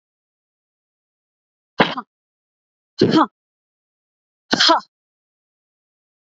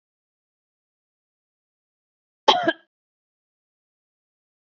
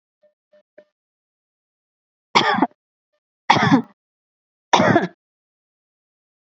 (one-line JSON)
{"exhalation_length": "6.4 s", "exhalation_amplitude": 29423, "exhalation_signal_mean_std_ratio": 0.24, "cough_length": "4.6 s", "cough_amplitude": 27663, "cough_signal_mean_std_ratio": 0.15, "three_cough_length": "6.5 s", "three_cough_amplitude": 32767, "three_cough_signal_mean_std_ratio": 0.29, "survey_phase": "beta (2021-08-13 to 2022-03-07)", "age": "18-44", "gender": "Female", "wearing_mask": "No", "symptom_none": true, "smoker_status": "Never smoked", "respiratory_condition_asthma": false, "respiratory_condition_other": false, "recruitment_source": "REACT", "submission_delay": "1 day", "covid_test_result": "Negative", "covid_test_method": "RT-qPCR"}